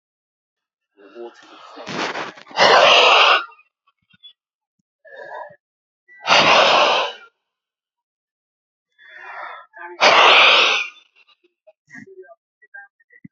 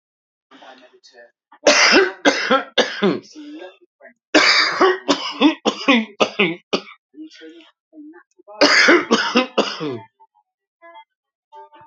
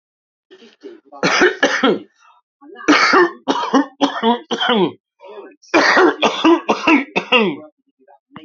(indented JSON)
{
  "exhalation_length": "13.3 s",
  "exhalation_amplitude": 32768,
  "exhalation_signal_mean_std_ratio": 0.4,
  "three_cough_length": "11.9 s",
  "three_cough_amplitude": 32767,
  "three_cough_signal_mean_std_ratio": 0.46,
  "cough_length": "8.4 s",
  "cough_amplitude": 32767,
  "cough_signal_mean_std_ratio": 0.54,
  "survey_phase": "beta (2021-08-13 to 2022-03-07)",
  "age": "45-64",
  "gender": "Female",
  "wearing_mask": "No",
  "symptom_cough_any": true,
  "symptom_runny_or_blocked_nose": true,
  "symptom_shortness_of_breath": true,
  "symptom_fatigue": true,
  "symptom_loss_of_taste": true,
  "symptom_onset": "12 days",
  "smoker_status": "Current smoker (11 or more cigarettes per day)",
  "respiratory_condition_asthma": false,
  "respiratory_condition_other": true,
  "recruitment_source": "REACT",
  "submission_delay": "1 day",
  "covid_test_result": "Negative",
  "covid_test_method": "RT-qPCR"
}